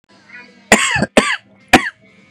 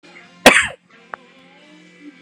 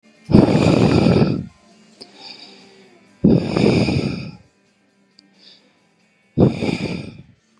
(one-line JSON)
{"three_cough_length": "2.3 s", "three_cough_amplitude": 32768, "three_cough_signal_mean_std_ratio": 0.39, "cough_length": "2.2 s", "cough_amplitude": 32768, "cough_signal_mean_std_ratio": 0.25, "exhalation_length": "7.6 s", "exhalation_amplitude": 32768, "exhalation_signal_mean_std_ratio": 0.47, "survey_phase": "beta (2021-08-13 to 2022-03-07)", "age": "18-44", "gender": "Male", "wearing_mask": "Yes", "symptom_none": true, "smoker_status": "Ex-smoker", "respiratory_condition_asthma": false, "respiratory_condition_other": false, "recruitment_source": "REACT", "submission_delay": "0 days", "covid_test_result": "Negative", "covid_test_method": "RT-qPCR", "influenza_a_test_result": "Negative", "influenza_b_test_result": "Negative"}